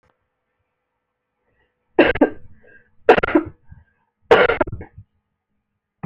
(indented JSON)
{
  "three_cough_length": "6.1 s",
  "three_cough_amplitude": 28981,
  "three_cough_signal_mean_std_ratio": 0.29,
  "survey_phase": "beta (2021-08-13 to 2022-03-07)",
  "age": "45-64",
  "gender": "Female",
  "wearing_mask": "No",
  "symptom_cough_any": true,
  "symptom_runny_or_blocked_nose": true,
  "symptom_fatigue": true,
  "symptom_headache": true,
  "smoker_status": "Never smoked",
  "respiratory_condition_asthma": false,
  "respiratory_condition_other": false,
  "recruitment_source": "Test and Trace",
  "submission_delay": "2 days",
  "covid_test_result": "Positive",
  "covid_test_method": "RT-qPCR",
  "covid_ct_value": 16.3,
  "covid_ct_gene": "ORF1ab gene",
  "covid_ct_mean": 16.8,
  "covid_viral_load": "3100000 copies/ml",
  "covid_viral_load_category": "High viral load (>1M copies/ml)"
}